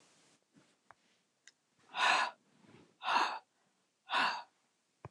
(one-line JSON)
{"exhalation_length": "5.1 s", "exhalation_amplitude": 5363, "exhalation_signal_mean_std_ratio": 0.36, "survey_phase": "beta (2021-08-13 to 2022-03-07)", "age": "45-64", "gender": "Female", "wearing_mask": "No", "symptom_cough_any": true, "symptom_new_continuous_cough": true, "symptom_runny_or_blocked_nose": true, "symptom_sore_throat": true, "symptom_fatigue": true, "symptom_headache": true, "smoker_status": "Never smoked", "respiratory_condition_asthma": false, "respiratory_condition_other": false, "recruitment_source": "Test and Trace", "submission_delay": "0 days", "covid_test_result": "Positive", "covid_test_method": "LFT"}